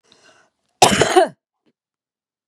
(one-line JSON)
{"cough_length": "2.5 s", "cough_amplitude": 32768, "cough_signal_mean_std_ratio": 0.31, "survey_phase": "beta (2021-08-13 to 2022-03-07)", "age": "45-64", "gender": "Female", "wearing_mask": "No", "symptom_none": true, "smoker_status": "Current smoker (1 to 10 cigarettes per day)", "respiratory_condition_asthma": false, "respiratory_condition_other": false, "recruitment_source": "REACT", "submission_delay": "2 days", "covid_test_result": "Negative", "covid_test_method": "RT-qPCR", "influenza_a_test_result": "Negative", "influenza_b_test_result": "Negative"}